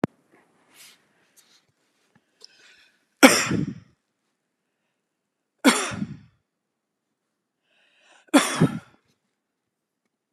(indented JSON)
{
  "three_cough_length": "10.3 s",
  "three_cough_amplitude": 32768,
  "three_cough_signal_mean_std_ratio": 0.22,
  "survey_phase": "beta (2021-08-13 to 2022-03-07)",
  "age": "45-64",
  "gender": "Male",
  "wearing_mask": "No",
  "symptom_none": true,
  "smoker_status": "Never smoked",
  "respiratory_condition_asthma": false,
  "respiratory_condition_other": false,
  "recruitment_source": "REACT",
  "submission_delay": "1 day",
  "covid_test_result": "Negative",
  "covid_test_method": "RT-qPCR"
}